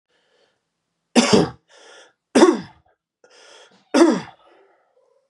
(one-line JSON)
{"three_cough_length": "5.3 s", "three_cough_amplitude": 30830, "three_cough_signal_mean_std_ratio": 0.31, "survey_phase": "beta (2021-08-13 to 2022-03-07)", "age": "18-44", "gender": "Male", "wearing_mask": "No", "symptom_new_continuous_cough": true, "symptom_runny_or_blocked_nose": true, "symptom_diarrhoea": true, "symptom_fatigue": true, "symptom_fever_high_temperature": true, "symptom_change_to_sense_of_smell_or_taste": true, "symptom_loss_of_taste": true, "symptom_onset": "4 days", "smoker_status": "Current smoker (e-cigarettes or vapes only)", "respiratory_condition_asthma": false, "respiratory_condition_other": false, "recruitment_source": "Test and Trace", "submission_delay": "1 day", "covid_test_result": "Positive", "covid_test_method": "RT-qPCR", "covid_ct_value": 19.7, "covid_ct_gene": "ORF1ab gene"}